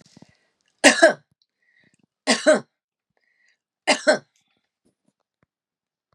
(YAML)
three_cough_length: 6.1 s
three_cough_amplitude: 32767
three_cough_signal_mean_std_ratio: 0.25
survey_phase: beta (2021-08-13 to 2022-03-07)
age: 45-64
gender: Female
wearing_mask: 'No'
symptom_none: true
smoker_status: Never smoked
respiratory_condition_asthma: false
respiratory_condition_other: false
recruitment_source: REACT
submission_delay: 1 day
covid_test_result: Negative
covid_test_method: RT-qPCR
influenza_a_test_result: Negative
influenza_b_test_result: Negative